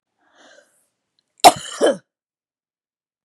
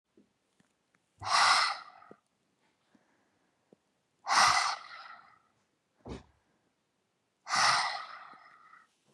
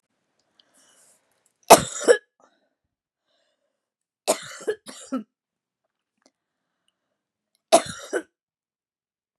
{"cough_length": "3.2 s", "cough_amplitude": 32768, "cough_signal_mean_std_ratio": 0.2, "exhalation_length": "9.1 s", "exhalation_amplitude": 8907, "exhalation_signal_mean_std_ratio": 0.34, "three_cough_length": "9.4 s", "three_cough_amplitude": 32768, "three_cough_signal_mean_std_ratio": 0.17, "survey_phase": "beta (2021-08-13 to 2022-03-07)", "age": "45-64", "gender": "Female", "wearing_mask": "No", "symptom_fatigue": true, "symptom_headache": true, "smoker_status": "Ex-smoker", "respiratory_condition_asthma": true, "respiratory_condition_other": false, "recruitment_source": "REACT", "submission_delay": "1 day", "covid_test_result": "Negative", "covid_test_method": "RT-qPCR", "influenza_a_test_result": "Unknown/Void", "influenza_b_test_result": "Unknown/Void"}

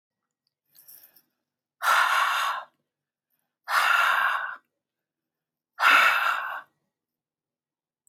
{"exhalation_length": "8.1 s", "exhalation_amplitude": 17190, "exhalation_signal_mean_std_ratio": 0.43, "survey_phase": "beta (2021-08-13 to 2022-03-07)", "age": "65+", "gender": "Female", "wearing_mask": "No", "symptom_none": true, "smoker_status": "Ex-smoker", "respiratory_condition_asthma": false, "respiratory_condition_other": false, "recruitment_source": "REACT", "submission_delay": "8 days", "covid_test_result": "Negative", "covid_test_method": "RT-qPCR", "influenza_a_test_result": "Negative", "influenza_b_test_result": "Negative"}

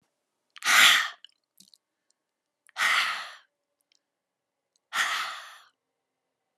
{"exhalation_length": "6.6 s", "exhalation_amplitude": 18238, "exhalation_signal_mean_std_ratio": 0.32, "survey_phase": "alpha (2021-03-01 to 2021-08-12)", "age": "65+", "gender": "Female", "wearing_mask": "No", "symptom_none": true, "symptom_onset": "2 days", "smoker_status": "Never smoked", "respiratory_condition_asthma": false, "respiratory_condition_other": false, "recruitment_source": "REACT", "submission_delay": "2 days", "covid_test_result": "Negative", "covid_test_method": "RT-qPCR"}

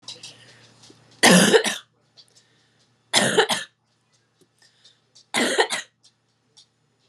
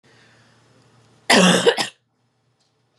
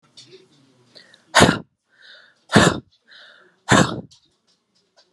{"three_cough_length": "7.1 s", "three_cough_amplitude": 28966, "three_cough_signal_mean_std_ratio": 0.33, "cough_length": "3.0 s", "cough_amplitude": 29074, "cough_signal_mean_std_ratio": 0.34, "exhalation_length": "5.1 s", "exhalation_amplitude": 32768, "exhalation_signal_mean_std_ratio": 0.29, "survey_phase": "beta (2021-08-13 to 2022-03-07)", "age": "18-44", "gender": "Female", "wearing_mask": "No", "symptom_runny_or_blocked_nose": true, "symptom_shortness_of_breath": true, "symptom_sore_throat": true, "symptom_fatigue": true, "symptom_fever_high_temperature": true, "symptom_headache": true, "symptom_onset": "7 days", "smoker_status": "Never smoked", "respiratory_condition_asthma": true, "respiratory_condition_other": false, "recruitment_source": "REACT", "submission_delay": "2 days", "covid_test_result": "Negative", "covid_test_method": "RT-qPCR", "influenza_a_test_result": "Negative", "influenza_b_test_result": "Negative"}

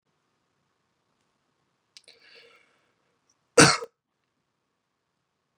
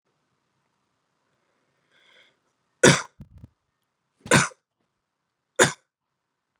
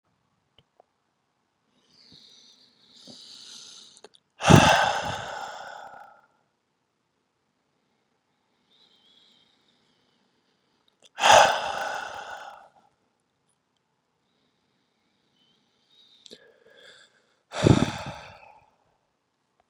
{"cough_length": "5.6 s", "cough_amplitude": 27421, "cough_signal_mean_std_ratio": 0.14, "three_cough_length": "6.6 s", "three_cough_amplitude": 30077, "three_cough_signal_mean_std_ratio": 0.19, "exhalation_length": "19.7 s", "exhalation_amplitude": 30128, "exhalation_signal_mean_std_ratio": 0.22, "survey_phase": "beta (2021-08-13 to 2022-03-07)", "age": "18-44", "gender": "Male", "wearing_mask": "No", "symptom_runny_or_blocked_nose": true, "symptom_onset": "8 days", "smoker_status": "Never smoked", "respiratory_condition_asthma": false, "respiratory_condition_other": false, "recruitment_source": "Test and Trace", "submission_delay": "1 day", "covid_test_result": "Positive", "covid_test_method": "ePCR"}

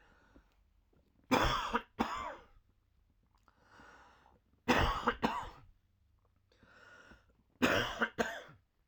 {"three_cough_length": "8.9 s", "three_cough_amplitude": 7241, "three_cough_signal_mean_std_ratio": 0.38, "survey_phase": "alpha (2021-03-01 to 2021-08-12)", "age": "65+", "gender": "Male", "wearing_mask": "No", "symptom_none": true, "symptom_onset": "5 days", "smoker_status": "Never smoked", "respiratory_condition_asthma": false, "respiratory_condition_other": false, "recruitment_source": "REACT", "submission_delay": "1 day", "covid_test_result": "Negative", "covid_test_method": "RT-qPCR"}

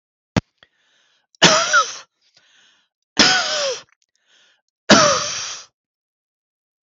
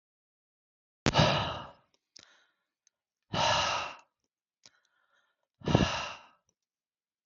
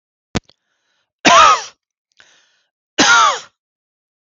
{"three_cough_length": "6.8 s", "three_cough_amplitude": 32768, "three_cough_signal_mean_std_ratio": 0.36, "exhalation_length": "7.3 s", "exhalation_amplitude": 19118, "exhalation_signal_mean_std_ratio": 0.34, "cough_length": "4.3 s", "cough_amplitude": 32766, "cough_signal_mean_std_ratio": 0.36, "survey_phase": "beta (2021-08-13 to 2022-03-07)", "age": "45-64", "gender": "Male", "wearing_mask": "No", "symptom_none": true, "smoker_status": "Ex-smoker", "respiratory_condition_asthma": false, "respiratory_condition_other": false, "recruitment_source": "REACT", "submission_delay": "3 days", "covid_test_result": "Negative", "covid_test_method": "RT-qPCR", "influenza_a_test_result": "Negative", "influenza_b_test_result": "Negative"}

